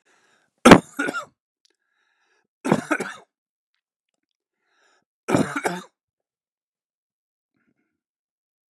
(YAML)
three_cough_length: 8.7 s
three_cough_amplitude: 32768
three_cough_signal_mean_std_ratio: 0.19
survey_phase: beta (2021-08-13 to 2022-03-07)
age: 45-64
gender: Male
wearing_mask: 'No'
symptom_none: true
symptom_onset: 12 days
smoker_status: Never smoked
respiratory_condition_asthma: false
respiratory_condition_other: false
recruitment_source: REACT
submission_delay: 2 days
covid_test_result: Negative
covid_test_method: RT-qPCR
influenza_a_test_result: Negative
influenza_b_test_result: Negative